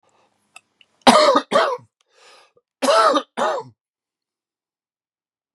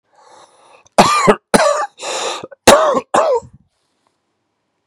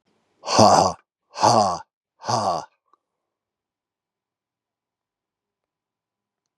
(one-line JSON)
{"three_cough_length": "5.5 s", "three_cough_amplitude": 32768, "three_cough_signal_mean_std_ratio": 0.36, "cough_length": "4.9 s", "cough_amplitude": 32768, "cough_signal_mean_std_ratio": 0.45, "exhalation_length": "6.6 s", "exhalation_amplitude": 29894, "exhalation_signal_mean_std_ratio": 0.31, "survey_phase": "beta (2021-08-13 to 2022-03-07)", "age": "45-64", "gender": "Male", "wearing_mask": "No", "symptom_runny_or_blocked_nose": true, "symptom_abdominal_pain": true, "symptom_fatigue": true, "symptom_fever_high_temperature": true, "symptom_headache": true, "symptom_change_to_sense_of_smell_or_taste": true, "symptom_loss_of_taste": true, "symptom_onset": "2 days", "smoker_status": "Ex-smoker", "respiratory_condition_asthma": false, "respiratory_condition_other": true, "recruitment_source": "Test and Trace", "submission_delay": "2 days", "covid_test_result": "Positive", "covid_test_method": "ePCR"}